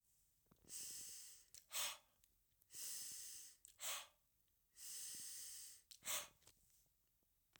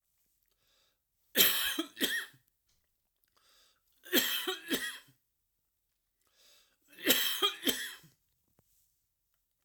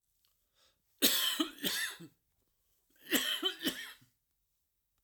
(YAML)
exhalation_length: 7.6 s
exhalation_amplitude: 925
exhalation_signal_mean_std_ratio: 0.54
three_cough_length: 9.6 s
three_cough_amplitude: 14315
three_cough_signal_mean_std_ratio: 0.35
cough_length: 5.0 s
cough_amplitude: 8460
cough_signal_mean_std_ratio: 0.41
survey_phase: alpha (2021-03-01 to 2021-08-12)
age: 45-64
gender: Male
wearing_mask: 'No'
symptom_cough_any: true
symptom_fatigue: true
symptom_onset: 3 days
smoker_status: Never smoked
respiratory_condition_asthma: false
respiratory_condition_other: false
recruitment_source: Test and Trace
submission_delay: 2 days
covid_test_result: Positive
covid_test_method: RT-qPCR
covid_ct_value: 22.2
covid_ct_gene: ORF1ab gene